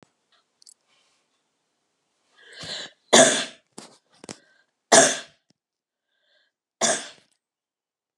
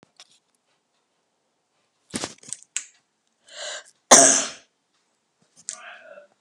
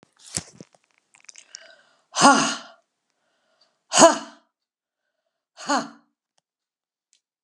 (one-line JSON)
{"three_cough_length": "8.2 s", "three_cough_amplitude": 32198, "three_cough_signal_mean_std_ratio": 0.23, "cough_length": "6.4 s", "cough_amplitude": 32768, "cough_signal_mean_std_ratio": 0.21, "exhalation_length": "7.4 s", "exhalation_amplitude": 32768, "exhalation_signal_mean_std_ratio": 0.23, "survey_phase": "beta (2021-08-13 to 2022-03-07)", "age": "65+", "gender": "Female", "wearing_mask": "No", "symptom_none": true, "smoker_status": "Ex-smoker", "respiratory_condition_asthma": false, "respiratory_condition_other": false, "recruitment_source": "REACT", "submission_delay": "1 day", "covid_test_result": "Negative", "covid_test_method": "RT-qPCR"}